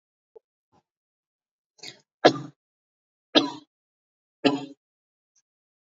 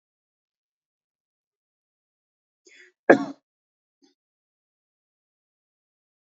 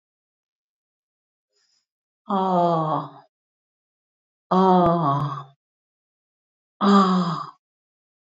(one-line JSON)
{"three_cough_length": "5.9 s", "three_cough_amplitude": 27555, "three_cough_signal_mean_std_ratio": 0.18, "cough_length": "6.4 s", "cough_amplitude": 26745, "cough_signal_mean_std_ratio": 0.1, "exhalation_length": "8.4 s", "exhalation_amplitude": 18622, "exhalation_signal_mean_std_ratio": 0.41, "survey_phase": "beta (2021-08-13 to 2022-03-07)", "age": "65+", "gender": "Female", "wearing_mask": "No", "symptom_none": true, "smoker_status": "Never smoked", "respiratory_condition_asthma": false, "respiratory_condition_other": false, "recruitment_source": "REACT", "submission_delay": "2 days", "covid_test_result": "Negative", "covid_test_method": "RT-qPCR", "influenza_a_test_result": "Negative", "influenza_b_test_result": "Negative"}